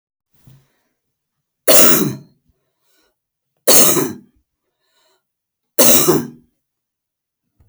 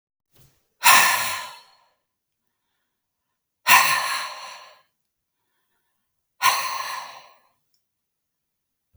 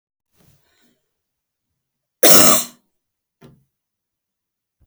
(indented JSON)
{
  "three_cough_length": "7.7 s",
  "three_cough_amplitude": 32768,
  "three_cough_signal_mean_std_ratio": 0.33,
  "exhalation_length": "9.0 s",
  "exhalation_amplitude": 31930,
  "exhalation_signal_mean_std_ratio": 0.31,
  "cough_length": "4.9 s",
  "cough_amplitude": 32768,
  "cough_signal_mean_std_ratio": 0.23,
  "survey_phase": "alpha (2021-03-01 to 2021-08-12)",
  "age": "65+",
  "gender": "Female",
  "wearing_mask": "No",
  "symptom_fatigue": true,
  "smoker_status": "Never smoked",
  "respiratory_condition_asthma": false,
  "respiratory_condition_other": false,
  "recruitment_source": "REACT",
  "submission_delay": "1 day",
  "covid_test_result": "Negative",
  "covid_test_method": "RT-qPCR"
}